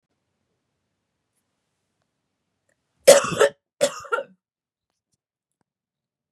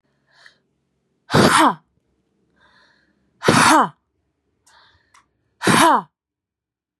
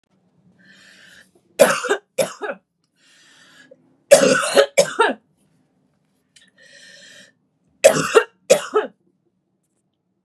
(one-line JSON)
{"cough_length": "6.3 s", "cough_amplitude": 32768, "cough_signal_mean_std_ratio": 0.19, "exhalation_length": "7.0 s", "exhalation_amplitude": 31360, "exhalation_signal_mean_std_ratio": 0.34, "three_cough_length": "10.2 s", "three_cough_amplitude": 32768, "three_cough_signal_mean_std_ratio": 0.31, "survey_phase": "beta (2021-08-13 to 2022-03-07)", "age": "18-44", "gender": "Female", "wearing_mask": "No", "symptom_runny_or_blocked_nose": true, "symptom_abdominal_pain": true, "symptom_fatigue": true, "symptom_headache": true, "symptom_other": true, "symptom_onset": "2 days", "smoker_status": "Ex-smoker", "respiratory_condition_asthma": false, "respiratory_condition_other": true, "recruitment_source": "Test and Trace", "submission_delay": "1 day", "covid_test_result": "Positive", "covid_test_method": "RT-qPCR"}